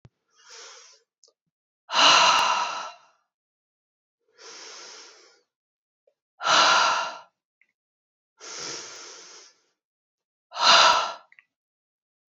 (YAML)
exhalation_length: 12.3 s
exhalation_amplitude: 22981
exhalation_signal_mean_std_ratio: 0.35
survey_phase: beta (2021-08-13 to 2022-03-07)
age: 18-44
gender: Female
wearing_mask: 'No'
symptom_cough_any: true
symptom_runny_or_blocked_nose: true
symptom_sore_throat: true
smoker_status: Never smoked
respiratory_condition_asthma: false
respiratory_condition_other: false
recruitment_source: Test and Trace
submission_delay: 0 days
covid_test_result: Positive
covid_test_method: LFT